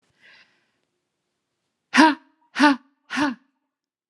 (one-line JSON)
{"exhalation_length": "4.1 s", "exhalation_amplitude": 28565, "exhalation_signal_mean_std_ratio": 0.29, "survey_phase": "alpha (2021-03-01 to 2021-08-12)", "age": "18-44", "gender": "Female", "wearing_mask": "No", "symptom_none": true, "symptom_onset": "12 days", "smoker_status": "Never smoked", "respiratory_condition_asthma": false, "respiratory_condition_other": false, "recruitment_source": "REACT", "submission_delay": "1 day", "covid_test_result": "Negative", "covid_test_method": "RT-qPCR"}